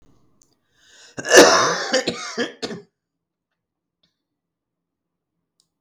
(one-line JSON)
{"cough_length": "5.8 s", "cough_amplitude": 32768, "cough_signal_mean_std_ratio": 0.28, "survey_phase": "beta (2021-08-13 to 2022-03-07)", "age": "65+", "gender": "Female", "wearing_mask": "No", "symptom_cough_any": true, "symptom_other": true, "smoker_status": "Never smoked", "respiratory_condition_asthma": false, "respiratory_condition_other": false, "recruitment_source": "REACT", "submission_delay": "1 day", "covid_test_result": "Negative", "covid_test_method": "RT-qPCR"}